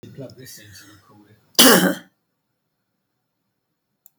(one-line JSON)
{"cough_length": "4.2 s", "cough_amplitude": 32768, "cough_signal_mean_std_ratio": 0.25, "survey_phase": "beta (2021-08-13 to 2022-03-07)", "age": "45-64", "gender": "Female", "wearing_mask": "No", "symptom_runny_or_blocked_nose": true, "smoker_status": "Never smoked", "respiratory_condition_asthma": false, "respiratory_condition_other": false, "recruitment_source": "REACT", "submission_delay": "1 day", "covid_test_result": "Negative", "covid_test_method": "RT-qPCR", "influenza_a_test_result": "Negative", "influenza_b_test_result": "Negative"}